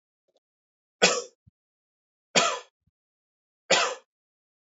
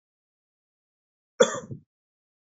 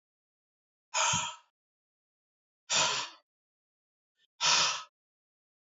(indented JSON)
{
  "three_cough_length": "4.8 s",
  "three_cough_amplitude": 18379,
  "three_cough_signal_mean_std_ratio": 0.27,
  "cough_length": "2.5 s",
  "cough_amplitude": 22042,
  "cough_signal_mean_std_ratio": 0.17,
  "exhalation_length": "5.6 s",
  "exhalation_amplitude": 7495,
  "exhalation_signal_mean_std_ratio": 0.35,
  "survey_phase": "beta (2021-08-13 to 2022-03-07)",
  "age": "45-64",
  "gender": "Male",
  "wearing_mask": "No",
  "symptom_none": true,
  "smoker_status": "Never smoked",
  "respiratory_condition_asthma": false,
  "respiratory_condition_other": false,
  "recruitment_source": "REACT",
  "submission_delay": "9 days",
  "covid_test_result": "Negative",
  "covid_test_method": "RT-qPCR"
}